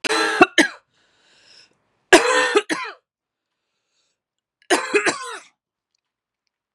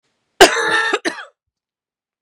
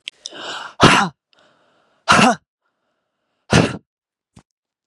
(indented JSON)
{
  "three_cough_length": "6.7 s",
  "three_cough_amplitude": 32768,
  "three_cough_signal_mean_std_ratio": 0.34,
  "cough_length": "2.2 s",
  "cough_amplitude": 32768,
  "cough_signal_mean_std_ratio": 0.37,
  "exhalation_length": "4.9 s",
  "exhalation_amplitude": 32767,
  "exhalation_signal_mean_std_ratio": 0.32,
  "survey_phase": "beta (2021-08-13 to 2022-03-07)",
  "age": "18-44",
  "gender": "Female",
  "wearing_mask": "No",
  "symptom_cough_any": true,
  "symptom_runny_or_blocked_nose": true,
  "symptom_fatigue": true,
  "symptom_headache": true,
  "smoker_status": "Ex-smoker",
  "respiratory_condition_asthma": false,
  "respiratory_condition_other": false,
  "recruitment_source": "Test and Trace",
  "submission_delay": "1 day",
  "covid_test_result": "Positive",
  "covid_test_method": "RT-qPCR",
  "covid_ct_value": 26.2,
  "covid_ct_gene": "ORF1ab gene"
}